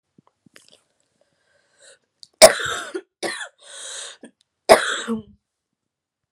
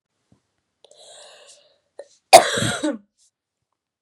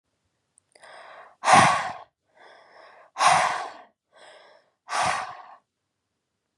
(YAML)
three_cough_length: 6.3 s
three_cough_amplitude: 32768
three_cough_signal_mean_std_ratio: 0.23
cough_length: 4.0 s
cough_amplitude: 32768
cough_signal_mean_std_ratio: 0.21
exhalation_length: 6.6 s
exhalation_amplitude: 23776
exhalation_signal_mean_std_ratio: 0.34
survey_phase: beta (2021-08-13 to 2022-03-07)
age: 18-44
gender: Female
wearing_mask: 'No'
symptom_cough_any: true
symptom_sore_throat: true
symptom_fatigue: true
symptom_headache: true
symptom_onset: 3 days
smoker_status: Never smoked
respiratory_condition_asthma: false
respiratory_condition_other: false
recruitment_source: Test and Trace
submission_delay: 1 day
covid_test_result: Positive
covid_test_method: RT-qPCR
covid_ct_value: 29.3
covid_ct_gene: N gene